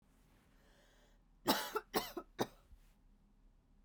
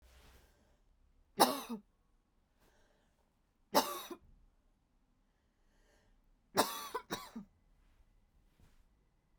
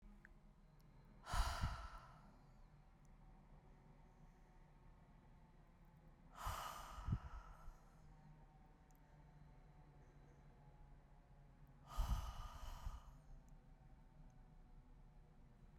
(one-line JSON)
{"cough_length": "3.8 s", "cough_amplitude": 4286, "cough_signal_mean_std_ratio": 0.31, "three_cough_length": "9.4 s", "three_cough_amplitude": 10634, "three_cough_signal_mean_std_ratio": 0.23, "exhalation_length": "15.8 s", "exhalation_amplitude": 1295, "exhalation_signal_mean_std_ratio": 0.49, "survey_phase": "beta (2021-08-13 to 2022-03-07)", "age": "18-44", "gender": "Female", "wearing_mask": "No", "symptom_fatigue": true, "symptom_headache": true, "symptom_onset": "12 days", "smoker_status": "Ex-smoker", "respiratory_condition_asthma": false, "respiratory_condition_other": false, "recruitment_source": "REACT", "submission_delay": "0 days", "covid_test_result": "Negative", "covid_test_method": "RT-qPCR"}